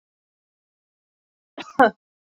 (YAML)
cough_length: 2.4 s
cough_amplitude: 26367
cough_signal_mean_std_ratio: 0.16
survey_phase: beta (2021-08-13 to 2022-03-07)
age: 18-44
gender: Female
wearing_mask: 'No'
symptom_none: true
smoker_status: Ex-smoker
respiratory_condition_asthma: false
respiratory_condition_other: false
recruitment_source: REACT
submission_delay: 1 day
covid_test_result: Negative
covid_test_method: RT-qPCR